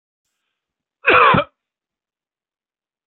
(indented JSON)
{
  "cough_length": "3.1 s",
  "cough_amplitude": 32424,
  "cough_signal_mean_std_ratio": 0.28,
  "survey_phase": "beta (2021-08-13 to 2022-03-07)",
  "age": "45-64",
  "gender": "Male",
  "wearing_mask": "No",
  "symptom_none": true,
  "smoker_status": "Ex-smoker",
  "respiratory_condition_asthma": false,
  "respiratory_condition_other": false,
  "recruitment_source": "REACT",
  "submission_delay": "1 day",
  "covid_test_result": "Negative",
  "covid_test_method": "RT-qPCR",
  "influenza_a_test_result": "Unknown/Void",
  "influenza_b_test_result": "Unknown/Void"
}